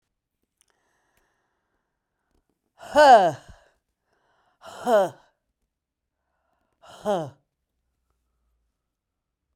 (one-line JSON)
{"exhalation_length": "9.6 s", "exhalation_amplitude": 23895, "exhalation_signal_mean_std_ratio": 0.23, "survey_phase": "alpha (2021-03-01 to 2021-08-12)", "age": "65+", "gender": "Female", "wearing_mask": "No", "symptom_headache": true, "smoker_status": "Never smoked", "respiratory_condition_asthma": true, "respiratory_condition_other": false, "recruitment_source": "Test and Trace", "submission_delay": "1 day", "covid_test_result": "Positive", "covid_test_method": "RT-qPCR", "covid_ct_value": 15.9, "covid_ct_gene": "ORF1ab gene", "covid_ct_mean": 16.6, "covid_viral_load": "3600000 copies/ml", "covid_viral_load_category": "High viral load (>1M copies/ml)"}